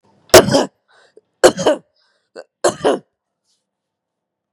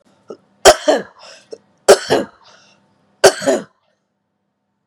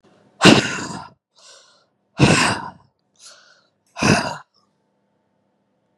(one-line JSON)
{"cough_length": "4.5 s", "cough_amplitude": 32768, "cough_signal_mean_std_ratio": 0.29, "three_cough_length": "4.9 s", "three_cough_amplitude": 32768, "three_cough_signal_mean_std_ratio": 0.29, "exhalation_length": "6.0 s", "exhalation_amplitude": 32768, "exhalation_signal_mean_std_ratio": 0.32, "survey_phase": "beta (2021-08-13 to 2022-03-07)", "age": "45-64", "gender": "Female", "wearing_mask": "No", "symptom_none": true, "smoker_status": "Never smoked", "respiratory_condition_asthma": false, "respiratory_condition_other": false, "recruitment_source": "REACT", "submission_delay": "5 days", "covid_test_result": "Negative", "covid_test_method": "RT-qPCR", "influenza_a_test_result": "Negative", "influenza_b_test_result": "Negative"}